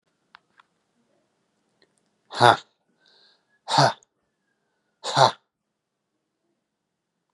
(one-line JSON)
{"exhalation_length": "7.3 s", "exhalation_amplitude": 32724, "exhalation_signal_mean_std_ratio": 0.21, "survey_phase": "beta (2021-08-13 to 2022-03-07)", "age": "18-44", "gender": "Male", "wearing_mask": "No", "symptom_cough_any": true, "smoker_status": "Never smoked", "respiratory_condition_asthma": false, "respiratory_condition_other": false, "recruitment_source": "REACT", "submission_delay": "1 day", "covid_test_result": "Negative", "covid_test_method": "RT-qPCR", "influenza_a_test_result": "Negative", "influenza_b_test_result": "Negative"}